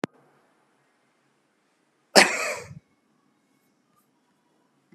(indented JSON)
{
  "cough_length": "4.9 s",
  "cough_amplitude": 32768,
  "cough_signal_mean_std_ratio": 0.18,
  "survey_phase": "beta (2021-08-13 to 2022-03-07)",
  "age": "65+",
  "gender": "Male",
  "wearing_mask": "No",
  "symptom_none": true,
  "smoker_status": "Ex-smoker",
  "respiratory_condition_asthma": false,
  "respiratory_condition_other": false,
  "recruitment_source": "REACT",
  "submission_delay": "1 day",
  "covid_test_result": "Negative",
  "covid_test_method": "RT-qPCR"
}